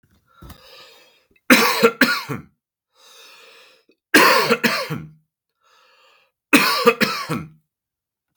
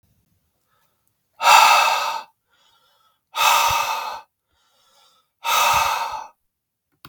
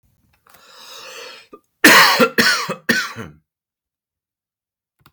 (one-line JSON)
{"three_cough_length": "8.4 s", "three_cough_amplitude": 32768, "three_cough_signal_mean_std_ratio": 0.38, "exhalation_length": "7.1 s", "exhalation_amplitude": 32768, "exhalation_signal_mean_std_ratio": 0.44, "cough_length": "5.1 s", "cough_amplitude": 32768, "cough_signal_mean_std_ratio": 0.35, "survey_phase": "beta (2021-08-13 to 2022-03-07)", "age": "18-44", "gender": "Male", "wearing_mask": "No", "symptom_cough_any": true, "symptom_runny_or_blocked_nose": true, "symptom_fatigue": true, "symptom_change_to_sense_of_smell_or_taste": true, "symptom_loss_of_taste": true, "smoker_status": "Never smoked", "respiratory_condition_asthma": false, "respiratory_condition_other": false, "recruitment_source": "Test and Trace", "submission_delay": "2 days", "covid_test_result": "Positive", "covid_test_method": "ePCR"}